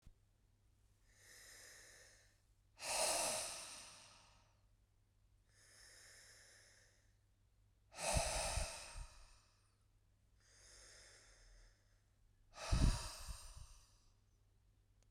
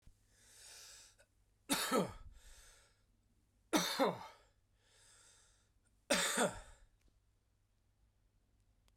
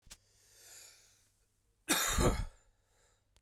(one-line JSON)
{"exhalation_length": "15.1 s", "exhalation_amplitude": 3281, "exhalation_signal_mean_std_ratio": 0.36, "three_cough_length": "9.0 s", "three_cough_amplitude": 3753, "three_cough_signal_mean_std_ratio": 0.33, "cough_length": "3.4 s", "cough_amplitude": 5275, "cough_signal_mean_std_ratio": 0.35, "survey_phase": "beta (2021-08-13 to 2022-03-07)", "age": "45-64", "gender": "Male", "wearing_mask": "No", "symptom_cough_any": true, "symptom_runny_or_blocked_nose": true, "symptom_fever_high_temperature": true, "smoker_status": "Ex-smoker", "respiratory_condition_asthma": false, "respiratory_condition_other": false, "recruitment_source": "Test and Trace", "submission_delay": "1 day", "covid_test_result": "Positive", "covid_test_method": "RT-qPCR"}